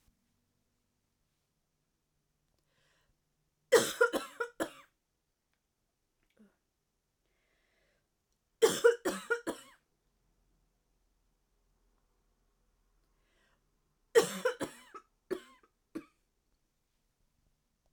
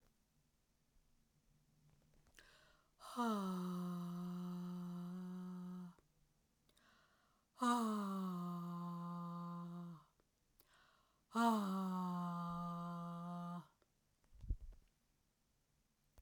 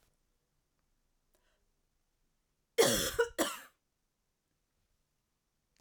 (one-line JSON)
{"three_cough_length": "17.9 s", "three_cough_amplitude": 8650, "three_cough_signal_mean_std_ratio": 0.2, "exhalation_length": "16.2 s", "exhalation_amplitude": 1925, "exhalation_signal_mean_std_ratio": 0.63, "cough_length": "5.8 s", "cough_amplitude": 7574, "cough_signal_mean_std_ratio": 0.24, "survey_phase": "beta (2021-08-13 to 2022-03-07)", "age": "45-64", "gender": "Female", "wearing_mask": "No", "symptom_cough_any": true, "symptom_runny_or_blocked_nose": true, "symptom_sore_throat": true, "symptom_headache": true, "symptom_change_to_sense_of_smell_or_taste": true, "symptom_loss_of_taste": true, "symptom_onset": "4 days", "smoker_status": "Never smoked", "respiratory_condition_asthma": false, "respiratory_condition_other": false, "recruitment_source": "Test and Trace", "submission_delay": "2 days", "covid_test_result": "Positive", "covid_test_method": "RT-qPCR"}